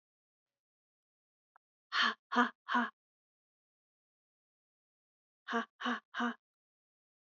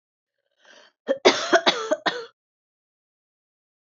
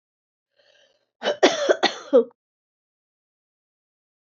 exhalation_length: 7.3 s
exhalation_amplitude: 5933
exhalation_signal_mean_std_ratio: 0.28
three_cough_length: 3.9 s
three_cough_amplitude: 26258
three_cough_signal_mean_std_ratio: 0.3
cough_length: 4.4 s
cough_amplitude: 24246
cough_signal_mean_std_ratio: 0.27
survey_phase: beta (2021-08-13 to 2022-03-07)
age: 45-64
gender: Female
wearing_mask: 'No'
symptom_runny_or_blocked_nose: true
symptom_onset: 1 day
smoker_status: Never smoked
respiratory_condition_asthma: true
respiratory_condition_other: false
recruitment_source: Test and Trace
submission_delay: 1 day
covid_test_result: Positive
covid_test_method: RT-qPCR
covid_ct_value: 17.0
covid_ct_gene: N gene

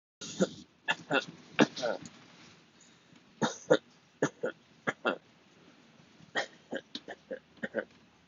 three_cough_length: 8.3 s
three_cough_amplitude: 12977
three_cough_signal_mean_std_ratio: 0.33
survey_phase: beta (2021-08-13 to 2022-03-07)
age: 18-44
gender: Male
wearing_mask: 'Yes'
symptom_none: true
smoker_status: Never smoked
respiratory_condition_asthma: false
respiratory_condition_other: false
recruitment_source: REACT
submission_delay: 2 days
covid_test_result: Negative
covid_test_method: RT-qPCR
influenza_a_test_result: Negative
influenza_b_test_result: Negative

